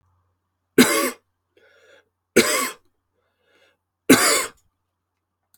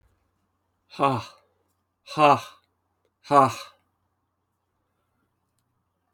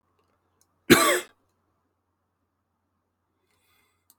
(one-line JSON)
{"three_cough_length": "5.6 s", "three_cough_amplitude": 32587, "three_cough_signal_mean_std_ratio": 0.31, "exhalation_length": "6.1 s", "exhalation_amplitude": 24981, "exhalation_signal_mean_std_ratio": 0.25, "cough_length": "4.2 s", "cough_amplitude": 30751, "cough_signal_mean_std_ratio": 0.2, "survey_phase": "alpha (2021-03-01 to 2021-08-12)", "age": "18-44", "gender": "Male", "wearing_mask": "No", "symptom_cough_any": true, "symptom_fatigue": true, "symptom_onset": "3 days", "smoker_status": "Never smoked", "respiratory_condition_asthma": false, "respiratory_condition_other": false, "recruitment_source": "Test and Trace", "submission_delay": "2 days", "covid_test_result": "Positive", "covid_test_method": "RT-qPCR"}